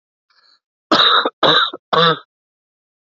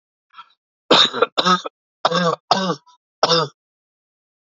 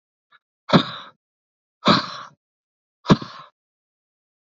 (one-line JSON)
{"cough_length": "3.2 s", "cough_amplitude": 29719, "cough_signal_mean_std_ratio": 0.44, "three_cough_length": "4.4 s", "three_cough_amplitude": 31669, "three_cough_signal_mean_std_ratio": 0.41, "exhalation_length": "4.4 s", "exhalation_amplitude": 28368, "exhalation_signal_mean_std_ratio": 0.25, "survey_phase": "alpha (2021-03-01 to 2021-08-12)", "age": "45-64", "gender": "Male", "wearing_mask": "No", "symptom_cough_any": true, "symptom_fatigue": true, "symptom_headache": true, "smoker_status": "Ex-smoker", "respiratory_condition_asthma": false, "respiratory_condition_other": false, "recruitment_source": "Test and Trace", "submission_delay": "2 days", "covid_test_result": "Positive", "covid_test_method": "RT-qPCR"}